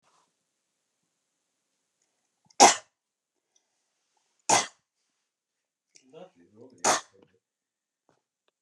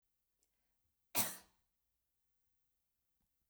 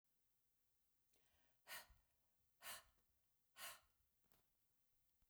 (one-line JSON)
{"three_cough_length": "8.6 s", "three_cough_amplitude": 26547, "three_cough_signal_mean_std_ratio": 0.16, "cough_length": "3.5 s", "cough_amplitude": 3303, "cough_signal_mean_std_ratio": 0.18, "exhalation_length": "5.3 s", "exhalation_amplitude": 286, "exhalation_signal_mean_std_ratio": 0.39, "survey_phase": "beta (2021-08-13 to 2022-03-07)", "age": "45-64", "gender": "Female", "wearing_mask": "No", "symptom_none": true, "smoker_status": "Never smoked", "respiratory_condition_asthma": false, "respiratory_condition_other": false, "recruitment_source": "REACT", "submission_delay": "1 day", "covid_test_result": "Negative", "covid_test_method": "RT-qPCR"}